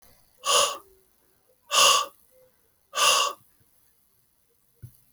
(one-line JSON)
{"exhalation_length": "5.1 s", "exhalation_amplitude": 16241, "exhalation_signal_mean_std_ratio": 0.36, "survey_phase": "alpha (2021-03-01 to 2021-08-12)", "age": "18-44", "gender": "Male", "wearing_mask": "No", "symptom_cough_any": true, "symptom_fever_high_temperature": true, "symptom_onset": "3 days", "smoker_status": "Never smoked", "respiratory_condition_asthma": false, "respiratory_condition_other": false, "recruitment_source": "Test and Trace", "submission_delay": "2 days", "covid_test_result": "Positive", "covid_test_method": "RT-qPCR", "covid_ct_value": 19.1, "covid_ct_gene": "ORF1ab gene", "covid_ct_mean": 21.3, "covid_viral_load": "100000 copies/ml", "covid_viral_load_category": "Low viral load (10K-1M copies/ml)"}